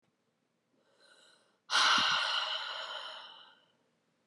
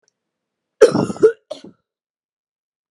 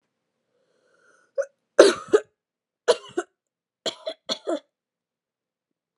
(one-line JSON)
{"exhalation_length": "4.3 s", "exhalation_amplitude": 5912, "exhalation_signal_mean_std_ratio": 0.44, "cough_length": "2.9 s", "cough_amplitude": 32768, "cough_signal_mean_std_ratio": 0.25, "three_cough_length": "6.0 s", "three_cough_amplitude": 32768, "three_cough_signal_mean_std_ratio": 0.22, "survey_phase": "alpha (2021-03-01 to 2021-08-12)", "age": "18-44", "gender": "Female", "wearing_mask": "No", "symptom_cough_any": true, "symptom_fatigue": true, "symptom_fever_high_temperature": true, "symptom_headache": true, "smoker_status": "Never smoked", "respiratory_condition_asthma": false, "respiratory_condition_other": false, "recruitment_source": "Test and Trace", "submission_delay": "2 days", "covid_test_result": "Positive", "covid_test_method": "RT-qPCR"}